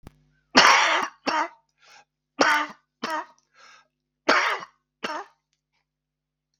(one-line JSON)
{"three_cough_length": "6.6 s", "three_cough_amplitude": 32767, "three_cough_signal_mean_std_ratio": 0.36, "survey_phase": "beta (2021-08-13 to 2022-03-07)", "age": "45-64", "gender": "Male", "wearing_mask": "No", "symptom_cough_any": true, "symptom_runny_or_blocked_nose": true, "symptom_shortness_of_breath": true, "symptom_fatigue": true, "symptom_change_to_sense_of_smell_or_taste": true, "symptom_onset": "11 days", "smoker_status": "Never smoked", "respiratory_condition_asthma": false, "respiratory_condition_other": false, "recruitment_source": "REACT", "submission_delay": "2 days", "covid_test_result": "Positive", "covid_test_method": "RT-qPCR", "covid_ct_value": 24.0, "covid_ct_gene": "E gene", "influenza_a_test_result": "Negative", "influenza_b_test_result": "Negative"}